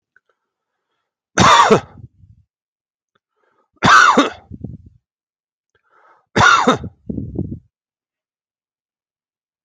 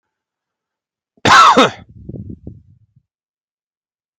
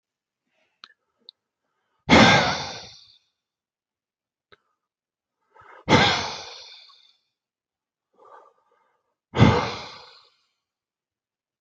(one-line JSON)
{"three_cough_length": "9.6 s", "three_cough_amplitude": 32155, "three_cough_signal_mean_std_ratio": 0.32, "cough_length": "4.2 s", "cough_amplitude": 32768, "cough_signal_mean_std_ratio": 0.29, "exhalation_length": "11.6 s", "exhalation_amplitude": 27559, "exhalation_signal_mean_std_ratio": 0.26, "survey_phase": "beta (2021-08-13 to 2022-03-07)", "age": "45-64", "gender": "Male", "wearing_mask": "No", "symptom_none": true, "smoker_status": "Ex-smoker", "respiratory_condition_asthma": false, "respiratory_condition_other": false, "recruitment_source": "REACT", "submission_delay": "1 day", "covid_test_result": "Negative", "covid_test_method": "RT-qPCR"}